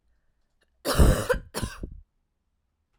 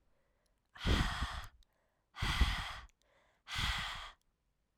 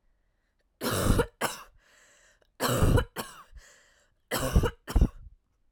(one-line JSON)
{"cough_length": "3.0 s", "cough_amplitude": 17413, "cough_signal_mean_std_ratio": 0.34, "exhalation_length": "4.8 s", "exhalation_amplitude": 4867, "exhalation_signal_mean_std_ratio": 0.47, "three_cough_length": "5.7 s", "three_cough_amplitude": 10660, "three_cough_signal_mean_std_ratio": 0.42, "survey_phase": "alpha (2021-03-01 to 2021-08-12)", "age": "18-44", "gender": "Female", "wearing_mask": "No", "symptom_cough_any": true, "symptom_shortness_of_breath": true, "symptom_fatigue": true, "symptom_headache": true, "symptom_change_to_sense_of_smell_or_taste": true, "symptom_loss_of_taste": true, "symptom_onset": "4 days", "smoker_status": "Never smoked", "respiratory_condition_asthma": false, "respiratory_condition_other": false, "recruitment_source": "Test and Trace", "submission_delay": "1 day", "covid_test_result": "Positive", "covid_test_method": "RT-qPCR", "covid_ct_value": 18.8, "covid_ct_gene": "N gene", "covid_ct_mean": 19.2, "covid_viral_load": "500000 copies/ml", "covid_viral_load_category": "Low viral load (10K-1M copies/ml)"}